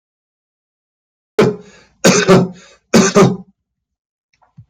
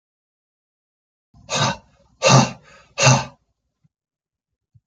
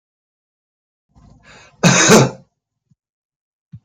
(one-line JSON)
{"three_cough_length": "4.7 s", "three_cough_amplitude": 31419, "three_cough_signal_mean_std_ratio": 0.38, "exhalation_length": "4.9 s", "exhalation_amplitude": 32767, "exhalation_signal_mean_std_ratio": 0.3, "cough_length": "3.8 s", "cough_amplitude": 32768, "cough_signal_mean_std_ratio": 0.29, "survey_phase": "beta (2021-08-13 to 2022-03-07)", "age": "45-64", "gender": "Male", "wearing_mask": "No", "symptom_runny_or_blocked_nose": true, "smoker_status": "Current smoker (1 to 10 cigarettes per day)", "respiratory_condition_asthma": false, "respiratory_condition_other": false, "recruitment_source": "Test and Trace", "submission_delay": "1 day", "covid_test_result": "Negative", "covid_test_method": "RT-qPCR"}